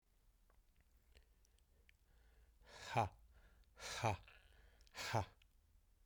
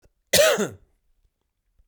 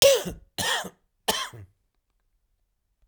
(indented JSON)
{
  "exhalation_length": "6.1 s",
  "exhalation_amplitude": 2385,
  "exhalation_signal_mean_std_ratio": 0.33,
  "cough_length": "1.9 s",
  "cough_amplitude": 22360,
  "cough_signal_mean_std_ratio": 0.35,
  "three_cough_length": "3.1 s",
  "three_cough_amplitude": 32767,
  "three_cough_signal_mean_std_ratio": 0.34,
  "survey_phase": "beta (2021-08-13 to 2022-03-07)",
  "age": "45-64",
  "gender": "Male",
  "wearing_mask": "No",
  "symptom_cough_any": true,
  "symptom_runny_or_blocked_nose": true,
  "symptom_change_to_sense_of_smell_or_taste": true,
  "symptom_loss_of_taste": true,
  "symptom_onset": "9 days",
  "smoker_status": "Never smoked",
  "respiratory_condition_asthma": false,
  "respiratory_condition_other": false,
  "recruitment_source": "Test and Trace",
  "submission_delay": "3 days",
  "covid_test_result": "Positive",
  "covid_test_method": "RT-qPCR",
  "covid_ct_value": 17.0,
  "covid_ct_gene": "ORF1ab gene",
  "covid_ct_mean": 18.4,
  "covid_viral_load": "890000 copies/ml",
  "covid_viral_load_category": "Low viral load (10K-1M copies/ml)"
}